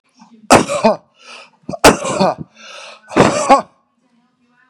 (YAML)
exhalation_length: 4.7 s
exhalation_amplitude: 32768
exhalation_signal_mean_std_ratio: 0.4
survey_phase: beta (2021-08-13 to 2022-03-07)
age: 45-64
gender: Female
wearing_mask: 'No'
symptom_cough_any: true
symptom_new_continuous_cough: true
symptom_runny_or_blocked_nose: true
symptom_shortness_of_breath: true
symptom_sore_throat: true
symptom_abdominal_pain: true
symptom_diarrhoea: true
symptom_fatigue: true
symptom_fever_high_temperature: true
symptom_headache: true
smoker_status: Never smoked
respiratory_condition_asthma: false
respiratory_condition_other: false
recruitment_source: Test and Trace
submission_delay: 2 days
covid_test_result: Negative
covid_test_method: LFT